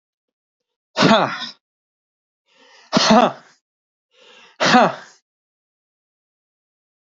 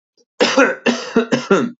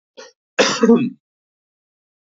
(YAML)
exhalation_length: 7.1 s
exhalation_amplitude: 28352
exhalation_signal_mean_std_ratio: 0.3
three_cough_length: 1.8 s
three_cough_amplitude: 27853
three_cough_signal_mean_std_ratio: 0.61
cough_length: 2.3 s
cough_amplitude: 26538
cough_signal_mean_std_ratio: 0.35
survey_phase: beta (2021-08-13 to 2022-03-07)
age: 18-44
gender: Male
wearing_mask: 'No'
symptom_sore_throat: true
symptom_onset: 5 days
smoker_status: Never smoked
respiratory_condition_asthma: false
respiratory_condition_other: false
recruitment_source: Test and Trace
submission_delay: 4 days
covid_test_result: Negative
covid_test_method: RT-qPCR